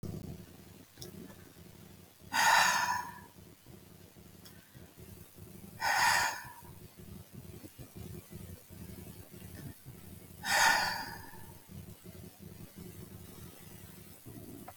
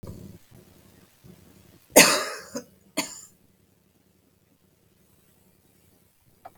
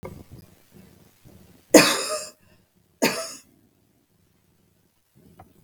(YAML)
exhalation_length: 14.8 s
exhalation_amplitude: 8129
exhalation_signal_mean_std_ratio: 0.44
cough_length: 6.6 s
cough_amplitude: 32766
cough_signal_mean_std_ratio: 0.2
three_cough_length: 5.6 s
three_cough_amplitude: 32768
three_cough_signal_mean_std_ratio: 0.23
survey_phase: beta (2021-08-13 to 2022-03-07)
age: 65+
gender: Female
wearing_mask: 'No'
symptom_none: true
smoker_status: Never smoked
respiratory_condition_asthma: false
respiratory_condition_other: false
recruitment_source: REACT
submission_delay: 2 days
covid_test_result: Negative
covid_test_method: RT-qPCR
influenza_a_test_result: Negative
influenza_b_test_result: Negative